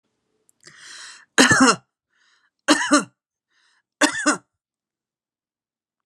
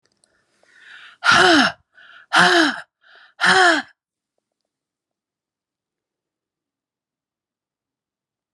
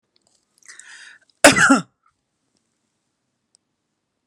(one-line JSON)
{"three_cough_length": "6.1 s", "three_cough_amplitude": 32258, "three_cough_signal_mean_std_ratio": 0.31, "exhalation_length": "8.5 s", "exhalation_amplitude": 29529, "exhalation_signal_mean_std_ratio": 0.32, "cough_length": "4.3 s", "cough_amplitude": 32768, "cough_signal_mean_std_ratio": 0.22, "survey_phase": "beta (2021-08-13 to 2022-03-07)", "age": "45-64", "gender": "Female", "wearing_mask": "No", "symptom_runny_or_blocked_nose": true, "symptom_fatigue": true, "smoker_status": "Ex-smoker", "respiratory_condition_asthma": false, "respiratory_condition_other": false, "recruitment_source": "REACT", "submission_delay": "2 days", "covid_test_result": "Negative", "covid_test_method": "RT-qPCR"}